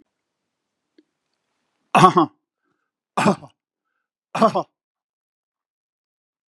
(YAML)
three_cough_length: 6.5 s
three_cough_amplitude: 32767
three_cough_signal_mean_std_ratio: 0.23
survey_phase: beta (2021-08-13 to 2022-03-07)
age: 65+
gender: Male
wearing_mask: 'No'
symptom_none: true
smoker_status: Never smoked
respiratory_condition_asthma: false
respiratory_condition_other: false
recruitment_source: REACT
submission_delay: 3 days
covid_test_result: Negative
covid_test_method: RT-qPCR
influenza_a_test_result: Negative
influenza_b_test_result: Negative